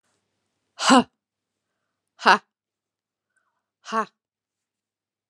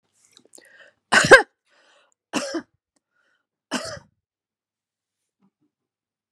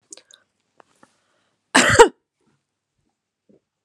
{"exhalation_length": "5.3 s", "exhalation_amplitude": 32358, "exhalation_signal_mean_std_ratio": 0.2, "three_cough_length": "6.3 s", "three_cough_amplitude": 32768, "three_cough_signal_mean_std_ratio": 0.18, "cough_length": "3.8 s", "cough_amplitude": 32768, "cough_signal_mean_std_ratio": 0.21, "survey_phase": "alpha (2021-03-01 to 2021-08-12)", "age": "45-64", "gender": "Female", "wearing_mask": "No", "symptom_none": true, "smoker_status": "Never smoked", "respiratory_condition_asthma": false, "respiratory_condition_other": false, "recruitment_source": "REACT", "submission_delay": "1 day", "covid_test_result": "Negative", "covid_test_method": "RT-qPCR"}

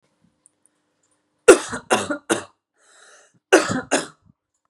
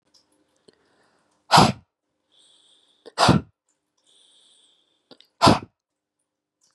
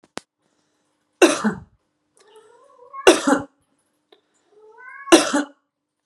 {"cough_length": "4.7 s", "cough_amplitude": 32768, "cough_signal_mean_std_ratio": 0.27, "exhalation_length": "6.7 s", "exhalation_amplitude": 32462, "exhalation_signal_mean_std_ratio": 0.23, "three_cough_length": "6.1 s", "three_cough_amplitude": 32768, "three_cough_signal_mean_std_ratio": 0.28, "survey_phase": "beta (2021-08-13 to 2022-03-07)", "age": "18-44", "gender": "Male", "wearing_mask": "No", "symptom_none": true, "smoker_status": "Never smoked", "respiratory_condition_asthma": false, "respiratory_condition_other": false, "recruitment_source": "REACT", "submission_delay": "1 day", "covid_test_result": "Negative", "covid_test_method": "RT-qPCR", "influenza_a_test_result": "Negative", "influenza_b_test_result": "Negative"}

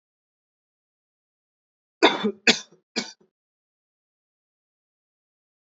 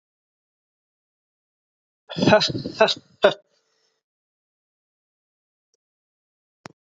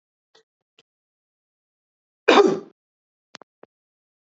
{"three_cough_length": "5.6 s", "three_cough_amplitude": 26206, "three_cough_signal_mean_std_ratio": 0.18, "exhalation_length": "6.8 s", "exhalation_amplitude": 27359, "exhalation_signal_mean_std_ratio": 0.22, "cough_length": "4.4 s", "cough_amplitude": 29303, "cough_signal_mean_std_ratio": 0.2, "survey_phase": "beta (2021-08-13 to 2022-03-07)", "age": "18-44", "gender": "Male", "wearing_mask": "No", "symptom_cough_any": true, "symptom_new_continuous_cough": true, "symptom_shortness_of_breath": true, "symptom_sore_throat": true, "symptom_fatigue": true, "symptom_headache": true, "symptom_onset": "2 days", "smoker_status": "Never smoked", "respiratory_condition_asthma": false, "respiratory_condition_other": false, "recruitment_source": "Test and Trace", "submission_delay": "2 days", "covid_test_result": "Positive", "covid_test_method": "RT-qPCR", "covid_ct_value": 17.3, "covid_ct_gene": "ORF1ab gene", "covid_ct_mean": 18.7, "covid_viral_load": "760000 copies/ml", "covid_viral_load_category": "Low viral load (10K-1M copies/ml)"}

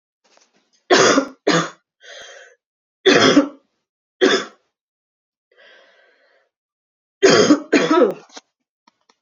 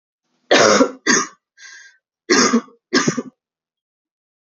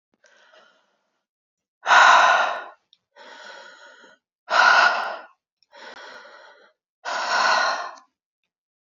{"three_cough_length": "9.2 s", "three_cough_amplitude": 32330, "three_cough_signal_mean_std_ratio": 0.37, "cough_length": "4.5 s", "cough_amplitude": 32768, "cough_signal_mean_std_ratio": 0.41, "exhalation_length": "8.9 s", "exhalation_amplitude": 26724, "exhalation_signal_mean_std_ratio": 0.39, "survey_phase": "beta (2021-08-13 to 2022-03-07)", "age": "18-44", "gender": "Female", "wearing_mask": "No", "symptom_cough_any": true, "symptom_runny_or_blocked_nose": true, "symptom_shortness_of_breath": true, "symptom_sore_throat": true, "symptom_fever_high_temperature": true, "symptom_headache": true, "symptom_onset": "4 days", "smoker_status": "Ex-smoker", "respiratory_condition_asthma": true, "respiratory_condition_other": false, "recruitment_source": "Test and Trace", "submission_delay": "1 day", "covid_test_result": "Positive", "covid_test_method": "RT-qPCR", "covid_ct_value": 18.9, "covid_ct_gene": "N gene"}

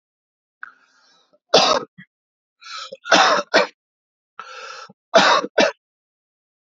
{"three_cough_length": "6.7 s", "three_cough_amplitude": 32768, "three_cough_signal_mean_std_ratio": 0.35, "survey_phase": "beta (2021-08-13 to 2022-03-07)", "age": "18-44", "gender": "Male", "wearing_mask": "No", "symptom_sore_throat": true, "symptom_onset": "4 days", "smoker_status": "Never smoked", "respiratory_condition_asthma": false, "respiratory_condition_other": false, "recruitment_source": "REACT", "submission_delay": "1 day", "covid_test_result": "Negative", "covid_test_method": "RT-qPCR"}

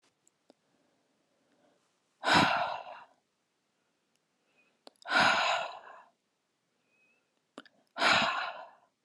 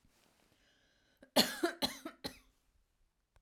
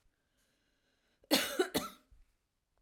{"exhalation_length": "9.0 s", "exhalation_amplitude": 7974, "exhalation_signal_mean_std_ratio": 0.35, "three_cough_length": "3.4 s", "three_cough_amplitude": 9883, "three_cough_signal_mean_std_ratio": 0.26, "cough_length": "2.8 s", "cough_amplitude": 7130, "cough_signal_mean_std_ratio": 0.3, "survey_phase": "alpha (2021-03-01 to 2021-08-12)", "age": "18-44", "gender": "Female", "wearing_mask": "No", "symptom_fatigue": true, "symptom_onset": "12 days", "smoker_status": "Ex-smoker", "respiratory_condition_asthma": false, "respiratory_condition_other": false, "recruitment_source": "REACT", "submission_delay": "1 day", "covid_test_result": "Negative", "covid_test_method": "RT-qPCR"}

